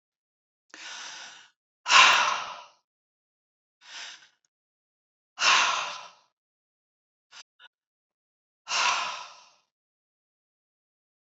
{"exhalation_length": "11.3 s", "exhalation_amplitude": 22323, "exhalation_signal_mean_std_ratio": 0.28, "survey_phase": "beta (2021-08-13 to 2022-03-07)", "age": "45-64", "gender": "Female", "wearing_mask": "No", "symptom_none": true, "smoker_status": "Never smoked", "respiratory_condition_asthma": false, "respiratory_condition_other": false, "recruitment_source": "REACT", "submission_delay": "3 days", "covid_test_result": "Negative", "covid_test_method": "RT-qPCR", "influenza_a_test_result": "Negative", "influenza_b_test_result": "Negative"}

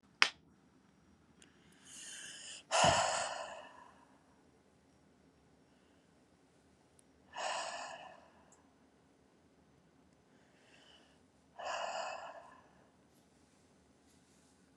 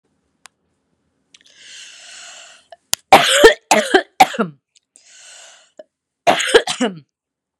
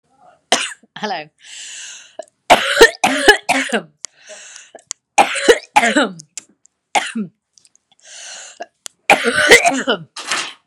{"exhalation_length": "14.8 s", "exhalation_amplitude": 16460, "exhalation_signal_mean_std_ratio": 0.3, "cough_length": "7.6 s", "cough_amplitude": 32768, "cough_signal_mean_std_ratio": 0.31, "three_cough_length": "10.7 s", "three_cough_amplitude": 32768, "three_cough_signal_mean_std_ratio": 0.41, "survey_phase": "beta (2021-08-13 to 2022-03-07)", "age": "45-64", "gender": "Female", "wearing_mask": "No", "symptom_sore_throat": true, "symptom_abdominal_pain": true, "symptom_fatigue": true, "symptom_headache": true, "symptom_onset": "7 days", "smoker_status": "Ex-smoker", "respiratory_condition_asthma": false, "respiratory_condition_other": false, "recruitment_source": "REACT", "submission_delay": "1 day", "covid_test_result": "Negative", "covid_test_method": "RT-qPCR", "influenza_a_test_result": "Unknown/Void", "influenza_b_test_result": "Unknown/Void"}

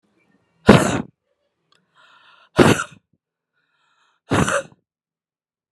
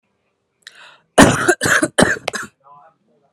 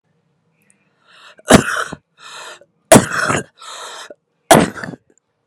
{"exhalation_length": "5.7 s", "exhalation_amplitude": 32768, "exhalation_signal_mean_std_ratio": 0.27, "cough_length": "3.3 s", "cough_amplitude": 32768, "cough_signal_mean_std_ratio": 0.38, "three_cough_length": "5.5 s", "three_cough_amplitude": 32768, "three_cough_signal_mean_std_ratio": 0.31, "survey_phase": "beta (2021-08-13 to 2022-03-07)", "age": "18-44", "gender": "Female", "wearing_mask": "No", "symptom_cough_any": true, "symptom_new_continuous_cough": true, "symptom_runny_or_blocked_nose": true, "symptom_diarrhoea": true, "symptom_fatigue": true, "symptom_headache": true, "symptom_onset": "3 days", "smoker_status": "Ex-smoker", "respiratory_condition_asthma": false, "respiratory_condition_other": false, "recruitment_source": "Test and Trace", "submission_delay": "1 day", "covid_test_result": "Positive", "covid_test_method": "RT-qPCR"}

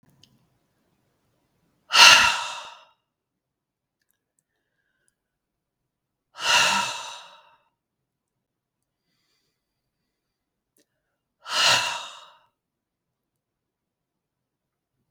{"exhalation_length": "15.1 s", "exhalation_amplitude": 32768, "exhalation_signal_mean_std_ratio": 0.23, "survey_phase": "beta (2021-08-13 to 2022-03-07)", "age": "45-64", "gender": "Female", "wearing_mask": "No", "symptom_none": true, "smoker_status": "Never smoked", "respiratory_condition_asthma": false, "respiratory_condition_other": false, "recruitment_source": "REACT", "submission_delay": "1 day", "covid_test_result": "Negative", "covid_test_method": "RT-qPCR", "influenza_a_test_result": "Negative", "influenza_b_test_result": "Negative"}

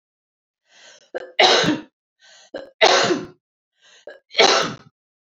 {"three_cough_length": "5.3 s", "three_cough_amplitude": 29915, "three_cough_signal_mean_std_ratio": 0.38, "survey_phase": "beta (2021-08-13 to 2022-03-07)", "age": "18-44", "gender": "Female", "wearing_mask": "No", "symptom_cough_any": true, "symptom_runny_or_blocked_nose": true, "smoker_status": "Never smoked", "respiratory_condition_asthma": false, "respiratory_condition_other": false, "recruitment_source": "Test and Trace", "submission_delay": "1 day", "covid_test_result": "Positive", "covid_test_method": "ePCR"}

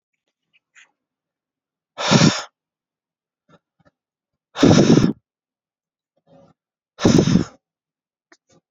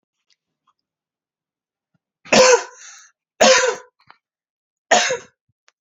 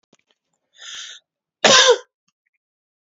{"exhalation_length": "8.7 s", "exhalation_amplitude": 29286, "exhalation_signal_mean_std_ratio": 0.29, "three_cough_length": "5.8 s", "three_cough_amplitude": 31093, "three_cough_signal_mean_std_ratio": 0.31, "cough_length": "3.1 s", "cough_amplitude": 31338, "cough_signal_mean_std_ratio": 0.28, "survey_phase": "beta (2021-08-13 to 2022-03-07)", "age": "18-44", "gender": "Male", "wearing_mask": "No", "symptom_cough_any": true, "symptom_fatigue": true, "symptom_fever_high_temperature": true, "symptom_headache": true, "symptom_change_to_sense_of_smell_or_taste": true, "symptom_loss_of_taste": true, "symptom_other": true, "smoker_status": "Never smoked", "respiratory_condition_asthma": false, "respiratory_condition_other": false, "recruitment_source": "Test and Trace", "submission_delay": "1 day", "covid_test_result": "Positive", "covid_test_method": "LFT"}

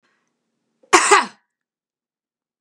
{"cough_length": "2.6 s", "cough_amplitude": 32767, "cough_signal_mean_std_ratio": 0.26, "survey_phase": "beta (2021-08-13 to 2022-03-07)", "age": "65+", "gender": "Female", "wearing_mask": "No", "symptom_runny_or_blocked_nose": true, "symptom_onset": "7 days", "smoker_status": "Ex-smoker", "respiratory_condition_asthma": false, "respiratory_condition_other": false, "recruitment_source": "REACT", "submission_delay": "3 days", "covid_test_result": "Negative", "covid_test_method": "RT-qPCR", "influenza_a_test_result": "Negative", "influenza_b_test_result": "Negative"}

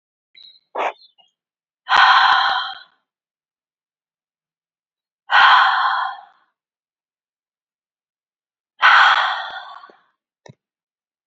{"exhalation_length": "11.3 s", "exhalation_amplitude": 31374, "exhalation_signal_mean_std_ratio": 0.36, "survey_phase": "beta (2021-08-13 to 2022-03-07)", "age": "18-44", "gender": "Female", "wearing_mask": "No", "symptom_cough_any": true, "symptom_new_continuous_cough": true, "symptom_runny_or_blocked_nose": true, "symptom_sore_throat": true, "symptom_fever_high_temperature": true, "symptom_onset": "2 days", "smoker_status": "Never smoked", "respiratory_condition_asthma": false, "respiratory_condition_other": false, "recruitment_source": "Test and Trace", "submission_delay": "1 day", "covid_test_result": "Positive", "covid_test_method": "RT-qPCR", "covid_ct_value": 18.9, "covid_ct_gene": "ORF1ab gene", "covid_ct_mean": 19.1, "covid_viral_load": "550000 copies/ml", "covid_viral_load_category": "Low viral load (10K-1M copies/ml)"}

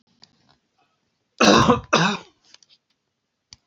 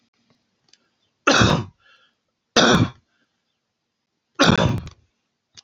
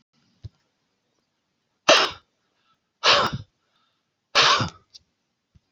{"cough_length": "3.7 s", "cough_amplitude": 26855, "cough_signal_mean_std_ratio": 0.33, "three_cough_length": "5.6 s", "three_cough_amplitude": 27267, "three_cough_signal_mean_std_ratio": 0.35, "exhalation_length": "5.7 s", "exhalation_amplitude": 27024, "exhalation_signal_mean_std_ratio": 0.3, "survey_phase": "alpha (2021-03-01 to 2021-08-12)", "age": "45-64", "gender": "Male", "wearing_mask": "No", "symptom_none": true, "smoker_status": "Ex-smoker", "respiratory_condition_asthma": false, "respiratory_condition_other": false, "recruitment_source": "REACT", "submission_delay": "1 day", "covid_test_result": "Negative", "covid_test_method": "RT-qPCR"}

